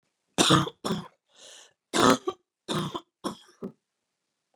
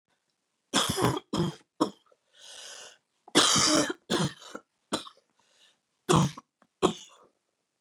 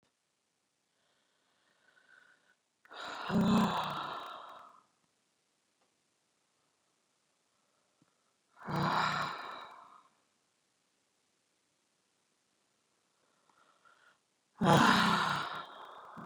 cough_length: 4.6 s
cough_amplitude: 20259
cough_signal_mean_std_ratio: 0.34
three_cough_length: 7.8 s
three_cough_amplitude: 15206
three_cough_signal_mean_std_ratio: 0.39
exhalation_length: 16.3 s
exhalation_amplitude: 7896
exhalation_signal_mean_std_ratio: 0.32
survey_phase: beta (2021-08-13 to 2022-03-07)
age: 45-64
gender: Female
wearing_mask: 'No'
symptom_cough_any: true
symptom_shortness_of_breath: true
symptom_onset: 12 days
smoker_status: Never smoked
respiratory_condition_asthma: true
respiratory_condition_other: false
recruitment_source: REACT
submission_delay: 1 day
covid_test_result: Negative
covid_test_method: RT-qPCR
influenza_a_test_result: Negative
influenza_b_test_result: Negative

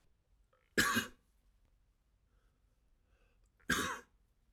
cough_length: 4.5 s
cough_amplitude: 5061
cough_signal_mean_std_ratio: 0.29
survey_phase: alpha (2021-03-01 to 2021-08-12)
age: 45-64
gender: Male
wearing_mask: 'No'
symptom_none: true
smoker_status: Never smoked
respiratory_condition_asthma: false
respiratory_condition_other: false
recruitment_source: REACT
submission_delay: 1 day
covid_test_result: Negative
covid_test_method: RT-qPCR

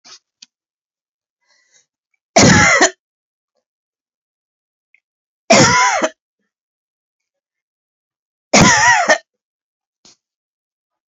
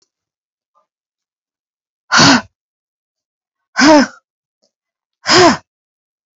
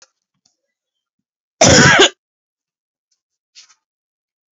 three_cough_length: 11.1 s
three_cough_amplitude: 32768
three_cough_signal_mean_std_ratio: 0.32
exhalation_length: 6.4 s
exhalation_amplitude: 32768
exhalation_signal_mean_std_ratio: 0.31
cough_length: 4.5 s
cough_amplitude: 32768
cough_signal_mean_std_ratio: 0.28
survey_phase: beta (2021-08-13 to 2022-03-07)
age: 45-64
gender: Female
wearing_mask: 'No'
symptom_abdominal_pain: true
symptom_diarrhoea: true
symptom_fatigue: true
symptom_headache: true
symptom_onset: 12 days
smoker_status: Ex-smoker
respiratory_condition_asthma: true
respiratory_condition_other: false
recruitment_source: REACT
submission_delay: 1 day
covid_test_result: Negative
covid_test_method: RT-qPCR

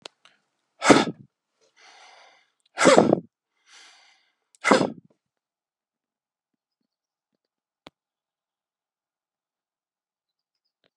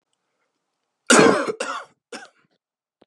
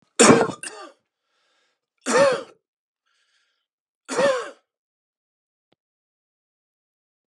exhalation_length: 11.0 s
exhalation_amplitude: 32768
exhalation_signal_mean_std_ratio: 0.2
cough_length: 3.1 s
cough_amplitude: 29072
cough_signal_mean_std_ratio: 0.31
three_cough_length: 7.3 s
three_cough_amplitude: 30200
three_cough_signal_mean_std_ratio: 0.28
survey_phase: beta (2021-08-13 to 2022-03-07)
age: 45-64
gender: Male
wearing_mask: 'No'
symptom_cough_any: true
symptom_runny_or_blocked_nose: true
symptom_sore_throat: true
symptom_fatigue: true
symptom_headache: true
symptom_onset: 4 days
smoker_status: Ex-smoker
respiratory_condition_asthma: false
respiratory_condition_other: false
recruitment_source: Test and Trace
submission_delay: 2 days
covid_test_result: Positive
covid_test_method: RT-qPCR
covid_ct_value: 25.1
covid_ct_gene: ORF1ab gene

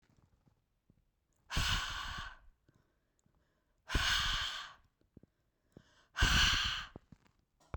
exhalation_length: 7.8 s
exhalation_amplitude: 4840
exhalation_signal_mean_std_ratio: 0.42
survey_phase: beta (2021-08-13 to 2022-03-07)
age: 18-44
gender: Female
wearing_mask: 'No'
symptom_none: true
smoker_status: Never smoked
respiratory_condition_asthma: false
respiratory_condition_other: false
recruitment_source: REACT
submission_delay: 32 days
covid_test_result: Negative
covid_test_method: RT-qPCR
influenza_a_test_result: Negative
influenza_b_test_result: Negative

